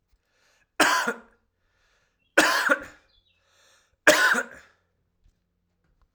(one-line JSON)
{"three_cough_length": "6.1 s", "three_cough_amplitude": 30486, "three_cough_signal_mean_std_ratio": 0.33, "survey_phase": "alpha (2021-03-01 to 2021-08-12)", "age": "45-64", "gender": "Male", "wearing_mask": "No", "symptom_none": true, "smoker_status": "Ex-smoker", "respiratory_condition_asthma": false, "respiratory_condition_other": false, "recruitment_source": "Test and Trace", "submission_delay": "1 day", "covid_test_result": "Positive", "covid_test_method": "RT-qPCR", "covid_ct_value": 12.1, "covid_ct_gene": "ORF1ab gene", "covid_ct_mean": 12.4, "covid_viral_load": "88000000 copies/ml", "covid_viral_load_category": "High viral load (>1M copies/ml)"}